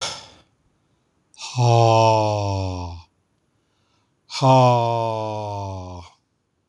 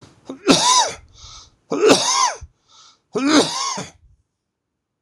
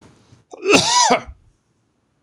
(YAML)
exhalation_length: 6.7 s
exhalation_amplitude: 23576
exhalation_signal_mean_std_ratio: 0.51
three_cough_length: 5.0 s
three_cough_amplitude: 26028
three_cough_signal_mean_std_ratio: 0.48
cough_length: 2.2 s
cough_amplitude: 26028
cough_signal_mean_std_ratio: 0.42
survey_phase: beta (2021-08-13 to 2022-03-07)
age: 65+
gender: Male
wearing_mask: 'No'
symptom_cough_any: true
symptom_runny_or_blocked_nose: true
symptom_fatigue: true
symptom_fever_high_temperature: true
symptom_change_to_sense_of_smell_or_taste: true
symptom_loss_of_taste: true
symptom_onset: 3 days
smoker_status: Never smoked
respiratory_condition_asthma: false
respiratory_condition_other: false
recruitment_source: Test and Trace
submission_delay: 2 days
covid_test_result: Positive
covid_test_method: RT-qPCR